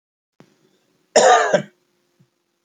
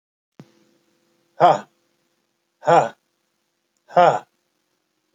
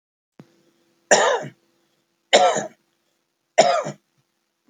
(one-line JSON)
{"cough_length": "2.6 s", "cough_amplitude": 29823, "cough_signal_mean_std_ratio": 0.33, "exhalation_length": "5.1 s", "exhalation_amplitude": 28118, "exhalation_signal_mean_std_ratio": 0.26, "three_cough_length": "4.7 s", "three_cough_amplitude": 29777, "three_cough_signal_mean_std_ratio": 0.33, "survey_phase": "beta (2021-08-13 to 2022-03-07)", "age": "45-64", "gender": "Male", "wearing_mask": "No", "symptom_none": true, "smoker_status": "Ex-smoker", "respiratory_condition_asthma": false, "respiratory_condition_other": false, "recruitment_source": "REACT", "submission_delay": "0 days", "covid_test_result": "Negative", "covid_test_method": "RT-qPCR"}